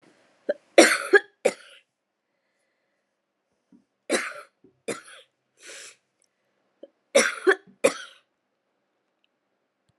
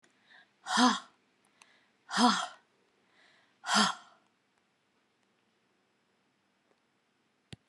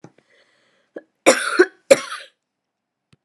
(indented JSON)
{
  "three_cough_length": "10.0 s",
  "three_cough_amplitude": 29981,
  "three_cough_signal_mean_std_ratio": 0.23,
  "exhalation_length": "7.7 s",
  "exhalation_amplitude": 9552,
  "exhalation_signal_mean_std_ratio": 0.27,
  "cough_length": "3.2 s",
  "cough_amplitude": 32768,
  "cough_signal_mean_std_ratio": 0.26,
  "survey_phase": "alpha (2021-03-01 to 2021-08-12)",
  "age": "65+",
  "gender": "Female",
  "wearing_mask": "No",
  "symptom_cough_any": true,
  "symptom_fatigue": true,
  "symptom_headache": true,
  "smoker_status": "Ex-smoker",
  "respiratory_condition_asthma": false,
  "respiratory_condition_other": false,
  "recruitment_source": "Test and Trace",
  "submission_delay": "2 days",
  "covid_test_result": "Positive",
  "covid_test_method": "RT-qPCR",
  "covid_ct_value": 12.5,
  "covid_ct_gene": "ORF1ab gene",
  "covid_ct_mean": 12.8,
  "covid_viral_load": "63000000 copies/ml",
  "covid_viral_load_category": "High viral load (>1M copies/ml)"
}